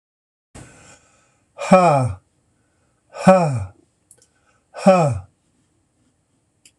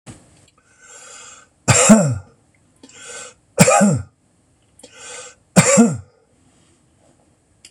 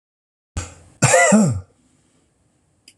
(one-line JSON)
{"exhalation_length": "6.8 s", "exhalation_amplitude": 26028, "exhalation_signal_mean_std_ratio": 0.33, "three_cough_length": "7.7 s", "three_cough_amplitude": 26028, "three_cough_signal_mean_std_ratio": 0.36, "cough_length": "3.0 s", "cough_amplitude": 26028, "cough_signal_mean_std_ratio": 0.39, "survey_phase": "beta (2021-08-13 to 2022-03-07)", "age": "65+", "gender": "Male", "wearing_mask": "No", "symptom_runny_or_blocked_nose": true, "symptom_onset": "12 days", "smoker_status": "Never smoked", "respiratory_condition_asthma": true, "respiratory_condition_other": false, "recruitment_source": "REACT", "submission_delay": "2 days", "covid_test_result": "Negative", "covid_test_method": "RT-qPCR", "influenza_a_test_result": "Negative", "influenza_b_test_result": "Negative"}